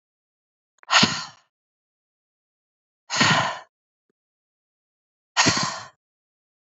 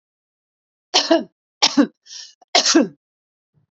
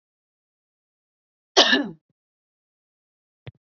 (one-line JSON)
{"exhalation_length": "6.7 s", "exhalation_amplitude": 30585, "exhalation_signal_mean_std_ratio": 0.31, "three_cough_length": "3.8 s", "three_cough_amplitude": 32087, "three_cough_signal_mean_std_ratio": 0.35, "cough_length": "3.7 s", "cough_amplitude": 30681, "cough_signal_mean_std_ratio": 0.21, "survey_phase": "beta (2021-08-13 to 2022-03-07)", "age": "45-64", "gender": "Female", "wearing_mask": "No", "symptom_none": true, "symptom_onset": "8 days", "smoker_status": "Ex-smoker", "respiratory_condition_asthma": false, "respiratory_condition_other": false, "recruitment_source": "REACT", "submission_delay": "10 days", "covid_test_result": "Negative", "covid_test_method": "RT-qPCR", "influenza_a_test_result": "Unknown/Void", "influenza_b_test_result": "Unknown/Void"}